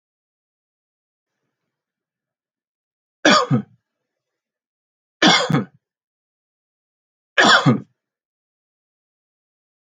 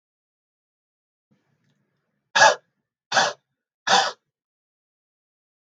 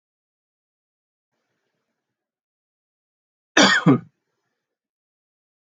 {"three_cough_length": "10.0 s", "three_cough_amplitude": 29250, "three_cough_signal_mean_std_ratio": 0.25, "exhalation_length": "5.6 s", "exhalation_amplitude": 29101, "exhalation_signal_mean_std_ratio": 0.24, "cough_length": "5.7 s", "cough_amplitude": 31104, "cough_signal_mean_std_ratio": 0.2, "survey_phase": "alpha (2021-03-01 to 2021-08-12)", "age": "45-64", "gender": "Male", "wearing_mask": "No", "symptom_none": true, "smoker_status": "Never smoked", "respiratory_condition_asthma": false, "respiratory_condition_other": false, "recruitment_source": "REACT", "submission_delay": "1 day", "covid_test_result": "Negative", "covid_test_method": "RT-qPCR"}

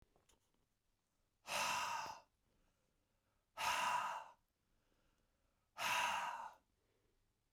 {"exhalation_length": "7.5 s", "exhalation_amplitude": 1562, "exhalation_signal_mean_std_ratio": 0.44, "survey_phase": "beta (2021-08-13 to 2022-03-07)", "age": "65+", "gender": "Male", "wearing_mask": "No", "symptom_cough_any": true, "symptom_runny_or_blocked_nose": true, "symptom_onset": "12 days", "smoker_status": "Never smoked", "respiratory_condition_asthma": false, "respiratory_condition_other": false, "recruitment_source": "REACT", "submission_delay": "3 days", "covid_test_result": "Negative", "covid_test_method": "RT-qPCR", "influenza_a_test_result": "Negative", "influenza_b_test_result": "Negative"}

